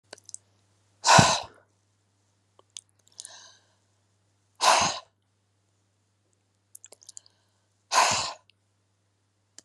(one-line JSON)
{"exhalation_length": "9.6 s", "exhalation_amplitude": 28770, "exhalation_signal_mean_std_ratio": 0.25, "survey_phase": "beta (2021-08-13 to 2022-03-07)", "age": "65+", "gender": "Female", "wearing_mask": "No", "symptom_none": true, "smoker_status": "Never smoked", "respiratory_condition_asthma": false, "respiratory_condition_other": false, "recruitment_source": "REACT", "submission_delay": "1 day", "covid_test_result": "Negative", "covid_test_method": "RT-qPCR"}